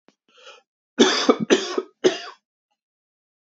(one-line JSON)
{"three_cough_length": "3.5 s", "three_cough_amplitude": 27881, "three_cough_signal_mean_std_ratio": 0.34, "survey_phase": "beta (2021-08-13 to 2022-03-07)", "age": "18-44", "gender": "Male", "wearing_mask": "No", "symptom_cough_any": true, "symptom_runny_or_blocked_nose": true, "symptom_shortness_of_breath": true, "symptom_onset": "4 days", "smoker_status": "Never smoked", "respiratory_condition_asthma": false, "respiratory_condition_other": false, "recruitment_source": "REACT", "submission_delay": "3 days", "covid_test_result": "Negative", "covid_test_method": "RT-qPCR", "covid_ct_value": 38.8, "covid_ct_gene": "N gene", "influenza_a_test_result": "Negative", "influenza_b_test_result": "Negative"}